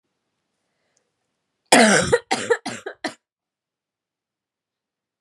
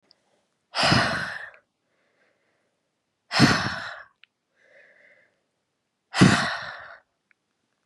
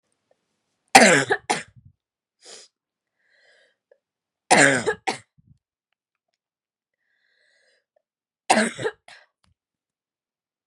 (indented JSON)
{
  "cough_length": "5.2 s",
  "cough_amplitude": 32768,
  "cough_signal_mean_std_ratio": 0.28,
  "exhalation_length": "7.9 s",
  "exhalation_amplitude": 28179,
  "exhalation_signal_mean_std_ratio": 0.33,
  "three_cough_length": "10.7 s",
  "three_cough_amplitude": 32768,
  "three_cough_signal_mean_std_ratio": 0.24,
  "survey_phase": "beta (2021-08-13 to 2022-03-07)",
  "age": "18-44",
  "gender": "Female",
  "wearing_mask": "No",
  "symptom_cough_any": true,
  "symptom_new_continuous_cough": true,
  "symptom_runny_or_blocked_nose": true,
  "symptom_sore_throat": true,
  "symptom_abdominal_pain": true,
  "symptom_fatigue": true,
  "symptom_fever_high_temperature": true,
  "symptom_headache": true,
  "symptom_onset": "3 days",
  "smoker_status": "Never smoked",
  "respiratory_condition_asthma": false,
  "respiratory_condition_other": false,
  "recruitment_source": "Test and Trace",
  "submission_delay": "1 day",
  "covid_test_result": "Positive",
  "covid_test_method": "RT-qPCR"
}